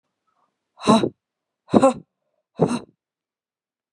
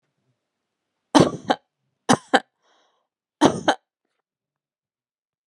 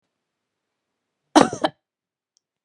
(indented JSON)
{
  "exhalation_length": "3.9 s",
  "exhalation_amplitude": 30164,
  "exhalation_signal_mean_std_ratio": 0.28,
  "three_cough_length": "5.5 s",
  "three_cough_amplitude": 32323,
  "three_cough_signal_mean_std_ratio": 0.23,
  "cough_length": "2.6 s",
  "cough_amplitude": 32767,
  "cough_signal_mean_std_ratio": 0.18,
  "survey_phase": "beta (2021-08-13 to 2022-03-07)",
  "age": "45-64",
  "gender": "Female",
  "wearing_mask": "No",
  "symptom_none": true,
  "smoker_status": "Never smoked",
  "respiratory_condition_asthma": false,
  "respiratory_condition_other": false,
  "recruitment_source": "REACT",
  "submission_delay": "2 days",
  "covid_test_result": "Negative",
  "covid_test_method": "RT-qPCR"
}